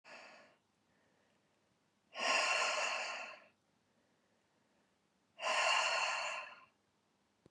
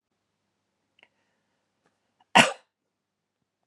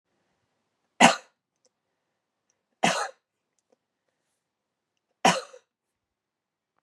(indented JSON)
{
  "exhalation_length": "7.5 s",
  "exhalation_amplitude": 2794,
  "exhalation_signal_mean_std_ratio": 0.46,
  "cough_length": "3.7 s",
  "cough_amplitude": 29929,
  "cough_signal_mean_std_ratio": 0.14,
  "three_cough_length": "6.8 s",
  "three_cough_amplitude": 27951,
  "three_cough_signal_mean_std_ratio": 0.19,
  "survey_phase": "beta (2021-08-13 to 2022-03-07)",
  "age": "45-64",
  "gender": "Female",
  "wearing_mask": "No",
  "symptom_fatigue": true,
  "symptom_headache": true,
  "smoker_status": "Never smoked",
  "respiratory_condition_asthma": false,
  "respiratory_condition_other": false,
  "recruitment_source": "Test and Trace",
  "submission_delay": "1 day",
  "covid_test_result": "Positive",
  "covid_test_method": "RT-qPCR",
  "covid_ct_value": 23.6,
  "covid_ct_gene": "ORF1ab gene"
}